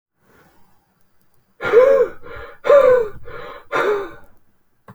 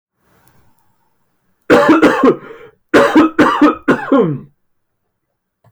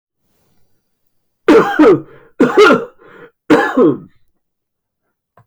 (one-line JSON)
{"exhalation_length": "4.9 s", "exhalation_amplitude": 26579, "exhalation_signal_mean_std_ratio": 0.45, "cough_length": "5.7 s", "cough_amplitude": 32120, "cough_signal_mean_std_ratio": 0.48, "three_cough_length": "5.5 s", "three_cough_amplitude": 30276, "three_cough_signal_mean_std_ratio": 0.42, "survey_phase": "alpha (2021-03-01 to 2021-08-12)", "age": "45-64", "gender": "Male", "wearing_mask": "No", "symptom_cough_any": true, "symptom_fatigue": true, "symptom_headache": true, "symptom_onset": "3 days", "smoker_status": "Never smoked", "respiratory_condition_asthma": false, "respiratory_condition_other": false, "recruitment_source": "Test and Trace", "submission_delay": "2 days", "covid_test_result": "Positive", "covid_test_method": "RT-qPCR"}